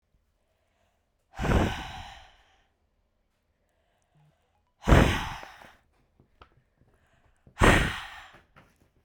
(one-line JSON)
{"exhalation_length": "9.0 s", "exhalation_amplitude": 21448, "exhalation_signal_mean_std_ratio": 0.28, "survey_phase": "beta (2021-08-13 to 2022-03-07)", "age": "18-44", "gender": "Female", "wearing_mask": "No", "symptom_runny_or_blocked_nose": true, "symptom_sore_throat": true, "symptom_fatigue": true, "symptom_fever_high_temperature": true, "symptom_headache": true, "symptom_change_to_sense_of_smell_or_taste": true, "symptom_loss_of_taste": true, "symptom_onset": "3 days", "smoker_status": "Current smoker (e-cigarettes or vapes only)", "respiratory_condition_asthma": false, "respiratory_condition_other": false, "recruitment_source": "Test and Trace", "submission_delay": "2 days", "covid_test_result": "Positive", "covid_test_method": "RT-qPCR", "covid_ct_value": 28.6, "covid_ct_gene": "ORF1ab gene", "covid_ct_mean": 29.5, "covid_viral_load": "210 copies/ml", "covid_viral_load_category": "Minimal viral load (< 10K copies/ml)"}